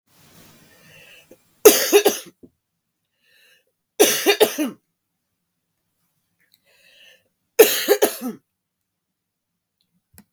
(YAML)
three_cough_length: 10.3 s
three_cough_amplitude: 32768
three_cough_signal_mean_std_ratio: 0.27
survey_phase: beta (2021-08-13 to 2022-03-07)
age: 45-64
gender: Female
wearing_mask: 'No'
symptom_cough_any: true
symptom_new_continuous_cough: true
symptom_runny_or_blocked_nose: true
symptom_shortness_of_breath: true
symptom_sore_throat: true
symptom_abdominal_pain: true
symptom_diarrhoea: true
symptom_fatigue: true
symptom_fever_high_temperature: true
symptom_onset: 17 days
smoker_status: Never smoked
respiratory_condition_asthma: false
respiratory_condition_other: false
recruitment_source: Test and Trace
submission_delay: 15 days
covid_test_result: Negative
covid_test_method: RT-qPCR